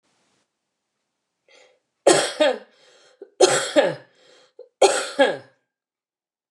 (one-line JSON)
{"three_cough_length": "6.5 s", "three_cough_amplitude": 27604, "three_cough_signal_mean_std_ratio": 0.34, "survey_phase": "beta (2021-08-13 to 2022-03-07)", "age": "65+", "gender": "Female", "wearing_mask": "No", "symptom_none": true, "smoker_status": "Never smoked", "respiratory_condition_asthma": false, "respiratory_condition_other": false, "recruitment_source": "REACT", "submission_delay": "12 days", "covid_test_result": "Negative", "covid_test_method": "RT-qPCR"}